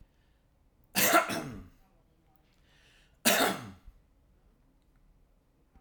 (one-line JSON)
{"cough_length": "5.8 s", "cough_amplitude": 11341, "cough_signal_mean_std_ratio": 0.31, "survey_phase": "alpha (2021-03-01 to 2021-08-12)", "age": "45-64", "gender": "Male", "wearing_mask": "Yes", "symptom_none": true, "smoker_status": "Never smoked", "respiratory_condition_asthma": false, "respiratory_condition_other": false, "recruitment_source": "Test and Trace", "submission_delay": "0 days", "covid_test_result": "Negative", "covid_test_method": "LFT"}